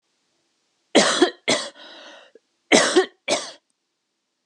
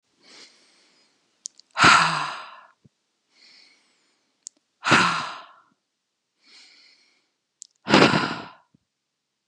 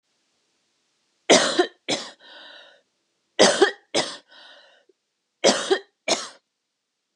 {
  "cough_length": "4.5 s",
  "cough_amplitude": 30527,
  "cough_signal_mean_std_ratio": 0.36,
  "exhalation_length": "9.5 s",
  "exhalation_amplitude": 31081,
  "exhalation_signal_mean_std_ratio": 0.29,
  "three_cough_length": "7.2 s",
  "three_cough_amplitude": 31682,
  "three_cough_signal_mean_std_ratio": 0.32,
  "survey_phase": "beta (2021-08-13 to 2022-03-07)",
  "age": "18-44",
  "gender": "Female",
  "wearing_mask": "No",
  "symptom_none": true,
  "smoker_status": "Ex-smoker",
  "respiratory_condition_asthma": false,
  "respiratory_condition_other": false,
  "recruitment_source": "REACT",
  "submission_delay": "1 day",
  "covid_test_result": "Negative",
  "covid_test_method": "RT-qPCR",
  "influenza_a_test_result": "Negative",
  "influenza_b_test_result": "Negative"
}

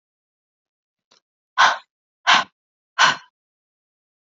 {
  "exhalation_length": "4.3 s",
  "exhalation_amplitude": 27392,
  "exhalation_signal_mean_std_ratio": 0.26,
  "survey_phase": "beta (2021-08-13 to 2022-03-07)",
  "age": "18-44",
  "gender": "Female",
  "wearing_mask": "No",
  "symptom_runny_or_blocked_nose": true,
  "smoker_status": "Never smoked",
  "respiratory_condition_asthma": false,
  "respiratory_condition_other": false,
  "recruitment_source": "Test and Trace",
  "submission_delay": "1 day",
  "covid_test_method": "RT-qPCR"
}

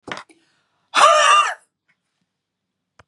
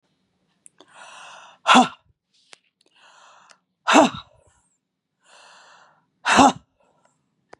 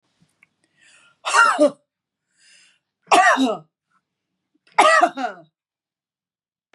{
  "cough_length": "3.1 s",
  "cough_amplitude": 30593,
  "cough_signal_mean_std_ratio": 0.37,
  "exhalation_length": "7.6 s",
  "exhalation_amplitude": 31834,
  "exhalation_signal_mean_std_ratio": 0.24,
  "three_cough_length": "6.7 s",
  "three_cough_amplitude": 32054,
  "three_cough_signal_mean_std_ratio": 0.35,
  "survey_phase": "beta (2021-08-13 to 2022-03-07)",
  "age": "45-64",
  "gender": "Female",
  "wearing_mask": "No",
  "symptom_none": true,
  "smoker_status": "Never smoked",
  "respiratory_condition_asthma": true,
  "respiratory_condition_other": false,
  "recruitment_source": "REACT",
  "submission_delay": "2 days",
  "covid_test_result": "Negative",
  "covid_test_method": "RT-qPCR",
  "influenza_a_test_result": "Negative",
  "influenza_b_test_result": "Negative"
}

